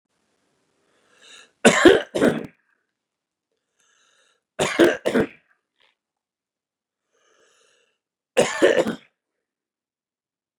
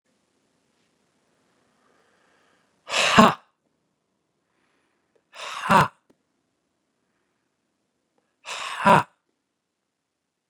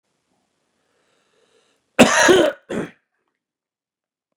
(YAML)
three_cough_length: 10.6 s
three_cough_amplitude: 32763
three_cough_signal_mean_std_ratio: 0.27
exhalation_length: 10.5 s
exhalation_amplitude: 32644
exhalation_signal_mean_std_ratio: 0.22
cough_length: 4.4 s
cough_amplitude: 32768
cough_signal_mean_std_ratio: 0.28
survey_phase: beta (2021-08-13 to 2022-03-07)
age: 45-64
gender: Male
wearing_mask: 'No'
symptom_none: true
smoker_status: Never smoked
respiratory_condition_asthma: false
respiratory_condition_other: false
recruitment_source: REACT
submission_delay: 3 days
covid_test_result: Negative
covid_test_method: RT-qPCR
influenza_a_test_result: Negative
influenza_b_test_result: Negative